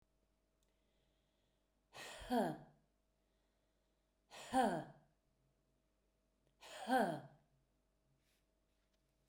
{
  "exhalation_length": "9.3 s",
  "exhalation_amplitude": 2300,
  "exhalation_signal_mean_std_ratio": 0.28,
  "survey_phase": "beta (2021-08-13 to 2022-03-07)",
  "age": "45-64",
  "gender": "Female",
  "wearing_mask": "No",
  "symptom_cough_any": true,
  "symptom_fatigue": true,
  "symptom_onset": "4 days",
  "smoker_status": "Never smoked",
  "respiratory_condition_asthma": true,
  "respiratory_condition_other": false,
  "recruitment_source": "REACT",
  "submission_delay": "1 day",
  "covid_test_result": "Negative",
  "covid_test_method": "RT-qPCR",
  "influenza_a_test_result": "Negative",
  "influenza_b_test_result": "Negative"
}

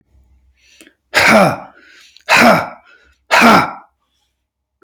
{
  "exhalation_length": "4.8 s",
  "exhalation_amplitude": 32768,
  "exhalation_signal_mean_std_ratio": 0.42,
  "survey_phase": "beta (2021-08-13 to 2022-03-07)",
  "age": "45-64",
  "gender": "Male",
  "wearing_mask": "No",
  "symptom_cough_any": true,
  "symptom_sore_throat": true,
  "smoker_status": "Never smoked",
  "respiratory_condition_asthma": true,
  "respiratory_condition_other": false,
  "recruitment_source": "REACT",
  "submission_delay": "1 day",
  "covid_test_result": "Negative",
  "covid_test_method": "RT-qPCR",
  "influenza_a_test_result": "Negative",
  "influenza_b_test_result": "Negative"
}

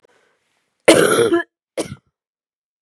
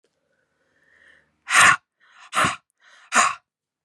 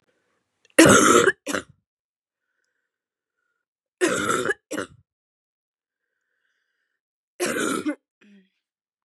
{
  "cough_length": "2.8 s",
  "cough_amplitude": 32768,
  "cough_signal_mean_std_ratio": 0.36,
  "exhalation_length": "3.8 s",
  "exhalation_amplitude": 27684,
  "exhalation_signal_mean_std_ratio": 0.32,
  "three_cough_length": "9.0 s",
  "three_cough_amplitude": 32768,
  "three_cough_signal_mean_std_ratio": 0.3,
  "survey_phase": "beta (2021-08-13 to 2022-03-07)",
  "age": "18-44",
  "gender": "Female",
  "wearing_mask": "No",
  "symptom_new_continuous_cough": true,
  "symptom_runny_or_blocked_nose": true,
  "symptom_sore_throat": true,
  "symptom_onset": "3 days",
  "smoker_status": "Never smoked",
  "respiratory_condition_asthma": false,
  "respiratory_condition_other": false,
  "recruitment_source": "Test and Trace",
  "submission_delay": "2 days",
  "covid_test_result": "Positive",
  "covid_test_method": "RT-qPCR",
  "covid_ct_value": 23.6,
  "covid_ct_gene": "N gene"
}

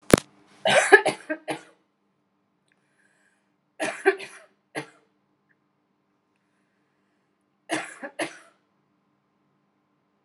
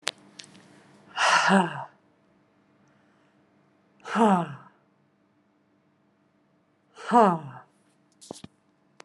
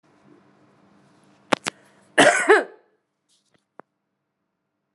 {
  "three_cough_length": "10.2 s",
  "three_cough_amplitude": 32768,
  "three_cough_signal_mean_std_ratio": 0.21,
  "exhalation_length": "9.0 s",
  "exhalation_amplitude": 23855,
  "exhalation_signal_mean_std_ratio": 0.3,
  "cough_length": "4.9 s",
  "cough_amplitude": 32768,
  "cough_signal_mean_std_ratio": 0.24,
  "survey_phase": "beta (2021-08-13 to 2022-03-07)",
  "age": "18-44",
  "gender": "Female",
  "wearing_mask": "Yes",
  "symptom_headache": true,
  "smoker_status": "Current smoker (11 or more cigarettes per day)",
  "respiratory_condition_asthma": false,
  "respiratory_condition_other": false,
  "recruitment_source": "REACT",
  "submission_delay": "2 days",
  "covid_test_result": "Negative",
  "covid_test_method": "RT-qPCR",
  "influenza_a_test_result": "Negative",
  "influenza_b_test_result": "Negative"
}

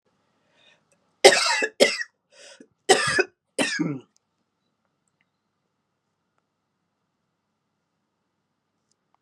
{
  "cough_length": "9.2 s",
  "cough_amplitude": 32444,
  "cough_signal_mean_std_ratio": 0.25,
  "survey_phase": "beta (2021-08-13 to 2022-03-07)",
  "age": "65+",
  "gender": "Female",
  "wearing_mask": "No",
  "symptom_cough_any": true,
  "symptom_runny_or_blocked_nose": true,
  "symptom_headache": true,
  "smoker_status": "Ex-smoker",
  "respiratory_condition_asthma": false,
  "respiratory_condition_other": false,
  "recruitment_source": "Test and Trace",
  "submission_delay": "1 day",
  "covid_test_result": "Positive",
  "covid_test_method": "ePCR"
}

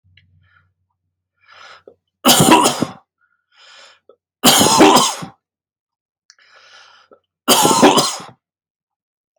{
  "three_cough_length": "9.4 s",
  "three_cough_amplitude": 32768,
  "three_cough_signal_mean_std_ratio": 0.38,
  "survey_phase": "alpha (2021-03-01 to 2021-08-12)",
  "age": "18-44",
  "gender": "Male",
  "wearing_mask": "No",
  "symptom_none": true,
  "smoker_status": "Never smoked",
  "respiratory_condition_asthma": false,
  "respiratory_condition_other": false,
  "recruitment_source": "REACT",
  "submission_delay": "1 day",
  "covid_test_result": "Negative",
  "covid_test_method": "RT-qPCR"
}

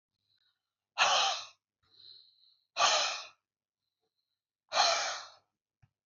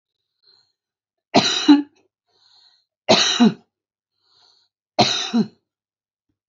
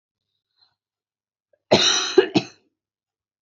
{
  "exhalation_length": "6.1 s",
  "exhalation_amplitude": 8112,
  "exhalation_signal_mean_std_ratio": 0.37,
  "three_cough_length": "6.5 s",
  "three_cough_amplitude": 29901,
  "three_cough_signal_mean_std_ratio": 0.33,
  "cough_length": "3.4 s",
  "cough_amplitude": 30371,
  "cough_signal_mean_std_ratio": 0.29,
  "survey_phase": "beta (2021-08-13 to 2022-03-07)",
  "age": "65+",
  "gender": "Female",
  "wearing_mask": "No",
  "symptom_none": true,
  "smoker_status": "Never smoked",
  "respiratory_condition_asthma": false,
  "respiratory_condition_other": false,
  "recruitment_source": "Test and Trace",
  "submission_delay": "1 day",
  "covid_test_result": "Negative",
  "covid_test_method": "RT-qPCR"
}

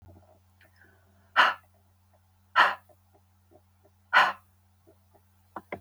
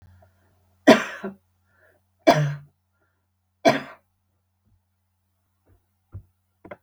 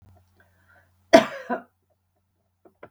{
  "exhalation_length": "5.8 s",
  "exhalation_amplitude": 16958,
  "exhalation_signal_mean_std_ratio": 0.25,
  "three_cough_length": "6.8 s",
  "three_cough_amplitude": 32766,
  "three_cough_signal_mean_std_ratio": 0.22,
  "cough_length": "2.9 s",
  "cough_amplitude": 32768,
  "cough_signal_mean_std_ratio": 0.18,
  "survey_phase": "beta (2021-08-13 to 2022-03-07)",
  "age": "65+",
  "gender": "Female",
  "wearing_mask": "No",
  "symptom_none": true,
  "smoker_status": "Never smoked",
  "respiratory_condition_asthma": false,
  "respiratory_condition_other": false,
  "recruitment_source": "REACT",
  "submission_delay": "3 days",
  "covid_test_result": "Negative",
  "covid_test_method": "RT-qPCR",
  "influenza_a_test_result": "Negative",
  "influenza_b_test_result": "Negative"
}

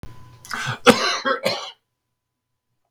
{
  "cough_length": "2.9 s",
  "cough_amplitude": 30813,
  "cough_signal_mean_std_ratio": 0.39,
  "survey_phase": "beta (2021-08-13 to 2022-03-07)",
  "age": "65+",
  "gender": "Male",
  "wearing_mask": "No",
  "symptom_cough_any": true,
  "symptom_fatigue": true,
  "smoker_status": "Never smoked",
  "respiratory_condition_asthma": false,
  "respiratory_condition_other": false,
  "recruitment_source": "REACT",
  "submission_delay": "3 days",
  "covid_test_result": "Negative",
  "covid_test_method": "RT-qPCR"
}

